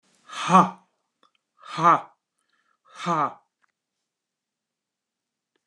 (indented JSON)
{
  "exhalation_length": "5.7 s",
  "exhalation_amplitude": 25381,
  "exhalation_signal_mean_std_ratio": 0.27,
  "survey_phase": "beta (2021-08-13 to 2022-03-07)",
  "age": "65+",
  "gender": "Male",
  "wearing_mask": "No",
  "symptom_none": true,
  "smoker_status": "Never smoked",
  "respiratory_condition_asthma": false,
  "respiratory_condition_other": false,
  "recruitment_source": "REACT",
  "submission_delay": "3 days",
  "covid_test_result": "Negative",
  "covid_test_method": "RT-qPCR",
  "influenza_a_test_result": "Negative",
  "influenza_b_test_result": "Negative"
}